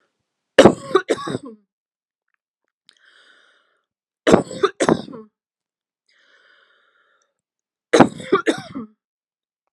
three_cough_length: 9.7 s
three_cough_amplitude: 32768
three_cough_signal_mean_std_ratio: 0.25
survey_phase: alpha (2021-03-01 to 2021-08-12)
age: 45-64
gender: Female
wearing_mask: 'No'
symptom_none: true
smoker_status: Never smoked
respiratory_condition_asthma: false
respiratory_condition_other: false
recruitment_source: REACT
submission_delay: 1 day
covid_test_result: Negative
covid_test_method: RT-qPCR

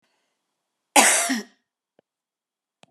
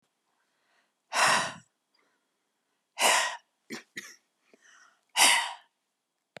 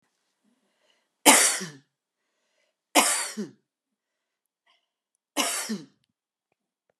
cough_length: 2.9 s
cough_amplitude: 28731
cough_signal_mean_std_ratio: 0.29
exhalation_length: 6.4 s
exhalation_amplitude: 14193
exhalation_signal_mean_std_ratio: 0.33
three_cough_length: 7.0 s
three_cough_amplitude: 30530
three_cough_signal_mean_std_ratio: 0.27
survey_phase: beta (2021-08-13 to 2022-03-07)
age: 45-64
gender: Female
wearing_mask: 'No'
symptom_none: true
smoker_status: Ex-smoker
respiratory_condition_asthma: false
respiratory_condition_other: false
recruitment_source: REACT
submission_delay: 1 day
covid_test_result: Negative
covid_test_method: RT-qPCR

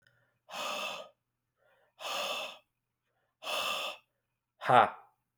exhalation_length: 5.4 s
exhalation_amplitude: 10503
exhalation_signal_mean_std_ratio: 0.35
survey_phase: alpha (2021-03-01 to 2021-08-12)
age: 18-44
gender: Male
wearing_mask: 'No'
symptom_cough_any: true
smoker_status: Never smoked
respiratory_condition_asthma: false
respiratory_condition_other: false
recruitment_source: REACT
submission_delay: 1 day
covid_test_result: Negative
covid_test_method: RT-qPCR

